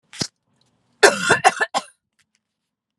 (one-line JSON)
{"cough_length": "3.0 s", "cough_amplitude": 32768, "cough_signal_mean_std_ratio": 0.3, "survey_phase": "alpha (2021-03-01 to 2021-08-12)", "age": "45-64", "gender": "Female", "wearing_mask": "No", "symptom_none": true, "smoker_status": "Ex-smoker", "respiratory_condition_asthma": false, "respiratory_condition_other": false, "recruitment_source": "REACT", "submission_delay": "2 days", "covid_test_result": "Negative", "covid_test_method": "RT-qPCR"}